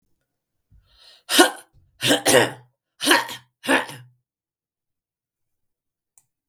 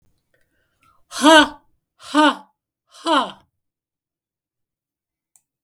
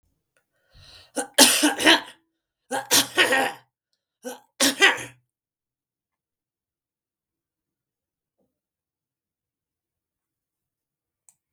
{
  "cough_length": "6.5 s",
  "cough_amplitude": 32768,
  "cough_signal_mean_std_ratio": 0.31,
  "exhalation_length": "5.6 s",
  "exhalation_amplitude": 32768,
  "exhalation_signal_mean_std_ratio": 0.27,
  "three_cough_length": "11.5 s",
  "three_cough_amplitude": 32767,
  "three_cough_signal_mean_std_ratio": 0.27,
  "survey_phase": "beta (2021-08-13 to 2022-03-07)",
  "age": "65+",
  "gender": "Female",
  "wearing_mask": "No",
  "symptom_cough_any": true,
  "smoker_status": "Never smoked",
  "respiratory_condition_asthma": false,
  "respiratory_condition_other": false,
  "recruitment_source": "REACT",
  "submission_delay": "1 day",
  "covid_test_result": "Negative",
  "covid_test_method": "RT-qPCR",
  "influenza_a_test_result": "Negative",
  "influenza_b_test_result": "Negative"
}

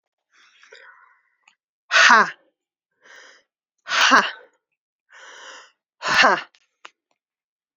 {
  "exhalation_length": "7.8 s",
  "exhalation_amplitude": 30011,
  "exhalation_signal_mean_std_ratio": 0.29,
  "survey_phase": "alpha (2021-03-01 to 2021-08-12)",
  "age": "18-44",
  "gender": "Female",
  "wearing_mask": "No",
  "symptom_cough_any": true,
  "symptom_new_continuous_cough": true,
  "symptom_shortness_of_breath": true,
  "symptom_fever_high_temperature": true,
  "symptom_headache": true,
  "symptom_change_to_sense_of_smell_or_taste": true,
  "smoker_status": "Ex-smoker",
  "respiratory_condition_asthma": false,
  "respiratory_condition_other": false,
  "recruitment_source": "Test and Trace",
  "submission_delay": "1 day",
  "covid_test_result": "Positive",
  "covid_test_method": "RT-qPCR",
  "covid_ct_value": 14.2,
  "covid_ct_gene": "ORF1ab gene",
  "covid_ct_mean": 15.3,
  "covid_viral_load": "9500000 copies/ml",
  "covid_viral_load_category": "High viral load (>1M copies/ml)"
}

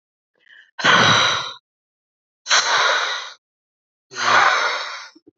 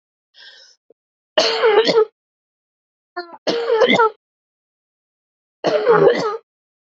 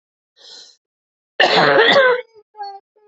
{
  "exhalation_length": "5.4 s",
  "exhalation_amplitude": 26667,
  "exhalation_signal_mean_std_ratio": 0.53,
  "three_cough_length": "7.0 s",
  "three_cough_amplitude": 32199,
  "three_cough_signal_mean_std_ratio": 0.44,
  "cough_length": "3.1 s",
  "cough_amplitude": 32231,
  "cough_signal_mean_std_ratio": 0.46,
  "survey_phase": "alpha (2021-03-01 to 2021-08-12)",
  "age": "18-44",
  "gender": "Female",
  "wearing_mask": "No",
  "symptom_cough_any": true,
  "symptom_onset": "4 days",
  "smoker_status": "Ex-smoker",
  "respiratory_condition_asthma": false,
  "respiratory_condition_other": false,
  "recruitment_source": "Test and Trace",
  "submission_delay": "2 days",
  "covid_test_result": "Positive",
  "covid_test_method": "RT-qPCR",
  "covid_ct_value": 33.0,
  "covid_ct_gene": "ORF1ab gene"
}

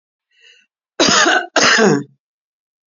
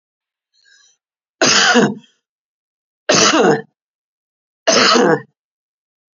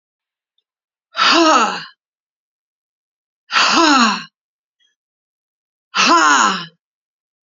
{
  "cough_length": "2.9 s",
  "cough_amplitude": 32726,
  "cough_signal_mean_std_ratio": 0.48,
  "three_cough_length": "6.1 s",
  "three_cough_amplitude": 32768,
  "three_cough_signal_mean_std_ratio": 0.42,
  "exhalation_length": "7.4 s",
  "exhalation_amplitude": 31032,
  "exhalation_signal_mean_std_ratio": 0.42,
  "survey_phase": "beta (2021-08-13 to 2022-03-07)",
  "age": "45-64",
  "gender": "Female",
  "wearing_mask": "No",
  "symptom_none": true,
  "smoker_status": "Never smoked",
  "respiratory_condition_asthma": true,
  "respiratory_condition_other": false,
  "recruitment_source": "REACT",
  "submission_delay": "1 day",
  "covid_test_result": "Negative",
  "covid_test_method": "RT-qPCR"
}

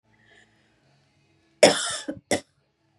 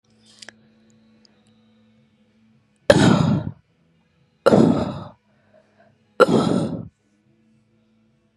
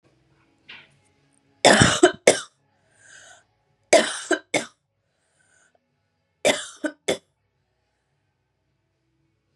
{
  "cough_length": "3.0 s",
  "cough_amplitude": 31280,
  "cough_signal_mean_std_ratio": 0.25,
  "exhalation_length": "8.4 s",
  "exhalation_amplitude": 32768,
  "exhalation_signal_mean_std_ratio": 0.33,
  "three_cough_length": "9.6 s",
  "three_cough_amplitude": 32762,
  "three_cough_signal_mean_std_ratio": 0.25,
  "survey_phase": "beta (2021-08-13 to 2022-03-07)",
  "age": "18-44",
  "gender": "Female",
  "wearing_mask": "No",
  "symptom_cough_any": true,
  "symptom_sore_throat": true,
  "symptom_fatigue": true,
  "smoker_status": "Never smoked",
  "respiratory_condition_asthma": false,
  "respiratory_condition_other": false,
  "recruitment_source": "Test and Trace",
  "submission_delay": "2 days",
  "covid_test_result": "Positive",
  "covid_test_method": "ePCR"
}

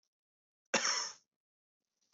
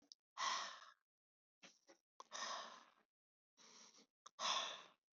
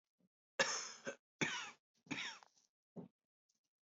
{
  "cough_length": "2.1 s",
  "cough_amplitude": 5158,
  "cough_signal_mean_std_ratio": 0.31,
  "exhalation_length": "5.1 s",
  "exhalation_amplitude": 1376,
  "exhalation_signal_mean_std_ratio": 0.4,
  "three_cough_length": "3.8 s",
  "three_cough_amplitude": 3385,
  "three_cough_signal_mean_std_ratio": 0.36,
  "survey_phase": "beta (2021-08-13 to 2022-03-07)",
  "age": "18-44",
  "gender": "Male",
  "wearing_mask": "No",
  "symptom_cough_any": true,
  "symptom_onset": "5 days",
  "smoker_status": "Ex-smoker",
  "respiratory_condition_asthma": true,
  "respiratory_condition_other": false,
  "recruitment_source": "Test and Trace",
  "submission_delay": "2 days",
  "covid_test_result": "Positive",
  "covid_test_method": "RT-qPCR",
  "covid_ct_value": 19.0,
  "covid_ct_gene": "ORF1ab gene",
  "covid_ct_mean": 19.2,
  "covid_viral_load": "510000 copies/ml",
  "covid_viral_load_category": "Low viral load (10K-1M copies/ml)"
}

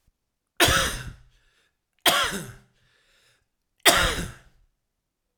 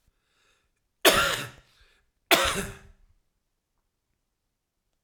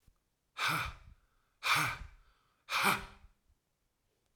{
  "three_cough_length": "5.4 s",
  "three_cough_amplitude": 32767,
  "three_cough_signal_mean_std_ratio": 0.35,
  "cough_length": "5.0 s",
  "cough_amplitude": 22514,
  "cough_signal_mean_std_ratio": 0.28,
  "exhalation_length": "4.4 s",
  "exhalation_amplitude": 5573,
  "exhalation_signal_mean_std_ratio": 0.4,
  "survey_phase": "alpha (2021-03-01 to 2021-08-12)",
  "age": "45-64",
  "gender": "Male",
  "wearing_mask": "No",
  "symptom_cough_any": true,
  "symptom_onset": "6 days",
  "smoker_status": "Never smoked",
  "respiratory_condition_asthma": false,
  "respiratory_condition_other": false,
  "recruitment_source": "REACT",
  "submission_delay": "2 days",
  "covid_test_result": "Negative",
  "covid_test_method": "RT-qPCR"
}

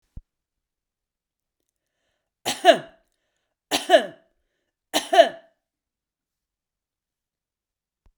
{
  "three_cough_length": "8.2 s",
  "three_cough_amplitude": 32345,
  "three_cough_signal_mean_std_ratio": 0.2,
  "survey_phase": "beta (2021-08-13 to 2022-03-07)",
  "age": "65+",
  "gender": "Female",
  "wearing_mask": "No",
  "symptom_other": true,
  "smoker_status": "Ex-smoker",
  "respiratory_condition_asthma": false,
  "respiratory_condition_other": false,
  "recruitment_source": "REACT",
  "submission_delay": "0 days",
  "covid_test_result": "Negative",
  "covid_test_method": "RT-qPCR"
}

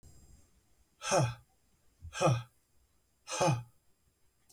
{
  "exhalation_length": "4.5 s",
  "exhalation_amplitude": 5470,
  "exhalation_signal_mean_std_ratio": 0.37,
  "survey_phase": "beta (2021-08-13 to 2022-03-07)",
  "age": "18-44",
  "gender": "Male",
  "wearing_mask": "No",
  "symptom_none": true,
  "smoker_status": "Ex-smoker",
  "respiratory_condition_asthma": true,
  "respiratory_condition_other": false,
  "recruitment_source": "Test and Trace",
  "submission_delay": "1 day",
  "covid_test_result": "Positive",
  "covid_test_method": "RT-qPCR",
  "covid_ct_value": 27.6,
  "covid_ct_gene": "ORF1ab gene"
}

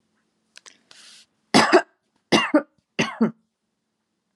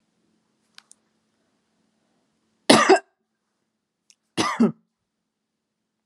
{
  "three_cough_length": "4.4 s",
  "three_cough_amplitude": 30710,
  "three_cough_signal_mean_std_ratio": 0.3,
  "cough_length": "6.1 s",
  "cough_amplitude": 32767,
  "cough_signal_mean_std_ratio": 0.22,
  "survey_phase": "alpha (2021-03-01 to 2021-08-12)",
  "age": "45-64",
  "gender": "Female",
  "wearing_mask": "No",
  "symptom_none": true,
  "smoker_status": "Never smoked",
  "respiratory_condition_asthma": false,
  "respiratory_condition_other": false,
  "recruitment_source": "Test and Trace",
  "submission_delay": "1 day",
  "covid_test_result": "Negative",
  "covid_test_method": "LFT"
}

